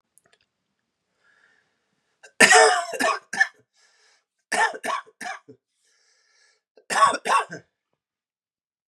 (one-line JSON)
{"three_cough_length": "8.9 s", "three_cough_amplitude": 32768, "three_cough_signal_mean_std_ratio": 0.31, "survey_phase": "beta (2021-08-13 to 2022-03-07)", "age": "18-44", "gender": "Male", "wearing_mask": "No", "symptom_cough_any": true, "symptom_runny_or_blocked_nose": true, "symptom_shortness_of_breath": true, "symptom_fatigue": true, "symptom_onset": "4 days", "smoker_status": "Never smoked", "respiratory_condition_asthma": false, "respiratory_condition_other": false, "recruitment_source": "Test and Trace", "submission_delay": "1 day", "covid_test_result": "Positive", "covid_test_method": "RT-qPCR"}